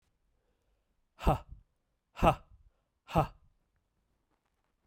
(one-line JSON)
{"exhalation_length": "4.9 s", "exhalation_amplitude": 9504, "exhalation_signal_mean_std_ratio": 0.23, "survey_phase": "beta (2021-08-13 to 2022-03-07)", "age": "45-64", "gender": "Male", "wearing_mask": "No", "symptom_cough_any": true, "symptom_runny_or_blocked_nose": true, "symptom_onset": "4 days", "smoker_status": "Never smoked", "respiratory_condition_asthma": false, "respiratory_condition_other": false, "recruitment_source": "Test and Trace", "submission_delay": "2 days", "covid_test_result": "Positive", "covid_test_method": "RT-qPCR", "covid_ct_value": 12.4, "covid_ct_gene": "ORF1ab gene"}